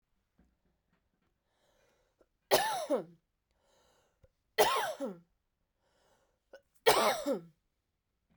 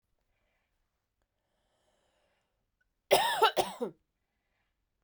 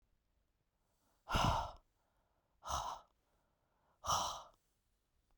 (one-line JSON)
{"three_cough_length": "8.4 s", "three_cough_amplitude": 9356, "three_cough_signal_mean_std_ratio": 0.31, "cough_length": "5.0 s", "cough_amplitude": 10274, "cough_signal_mean_std_ratio": 0.25, "exhalation_length": "5.4 s", "exhalation_amplitude": 2444, "exhalation_signal_mean_std_ratio": 0.35, "survey_phase": "beta (2021-08-13 to 2022-03-07)", "age": "45-64", "gender": "Female", "wearing_mask": "No", "symptom_change_to_sense_of_smell_or_taste": true, "symptom_onset": "8 days", "smoker_status": "Ex-smoker", "respiratory_condition_asthma": false, "respiratory_condition_other": false, "recruitment_source": "REACT", "submission_delay": "1 day", "covid_test_result": "Positive", "covid_test_method": "RT-qPCR", "covid_ct_value": 28.0, "covid_ct_gene": "E gene"}